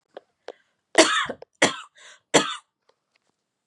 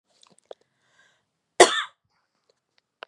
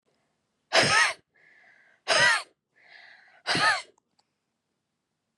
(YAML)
three_cough_length: 3.7 s
three_cough_amplitude: 29483
three_cough_signal_mean_std_ratio: 0.29
cough_length: 3.1 s
cough_amplitude: 32767
cough_signal_mean_std_ratio: 0.16
exhalation_length: 5.4 s
exhalation_amplitude: 14446
exhalation_signal_mean_std_ratio: 0.37
survey_phase: beta (2021-08-13 to 2022-03-07)
age: 18-44
gender: Female
wearing_mask: 'No'
symptom_cough_any: true
symptom_runny_or_blocked_nose: true
symptom_shortness_of_breath: true
symptom_sore_throat: true
symptom_fatigue: true
symptom_fever_high_temperature: true
symptom_headache: true
smoker_status: Ex-smoker
respiratory_condition_asthma: false
respiratory_condition_other: false
recruitment_source: Test and Trace
submission_delay: 1 day
covid_test_result: Positive
covid_test_method: LFT